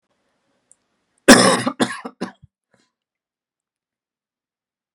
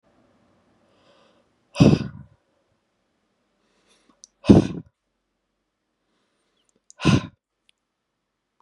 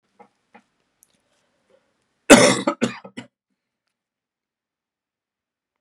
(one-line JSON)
{"cough_length": "4.9 s", "cough_amplitude": 32768, "cough_signal_mean_std_ratio": 0.23, "exhalation_length": "8.6 s", "exhalation_amplitude": 32561, "exhalation_signal_mean_std_ratio": 0.2, "three_cough_length": "5.8 s", "three_cough_amplitude": 32768, "three_cough_signal_mean_std_ratio": 0.19, "survey_phase": "beta (2021-08-13 to 2022-03-07)", "age": "18-44", "gender": "Male", "wearing_mask": "No", "symptom_none": true, "symptom_onset": "12 days", "smoker_status": "Never smoked", "respiratory_condition_asthma": false, "respiratory_condition_other": false, "recruitment_source": "REACT", "submission_delay": "0 days", "covid_test_result": "Negative", "covid_test_method": "RT-qPCR", "influenza_a_test_result": "Negative", "influenza_b_test_result": "Negative"}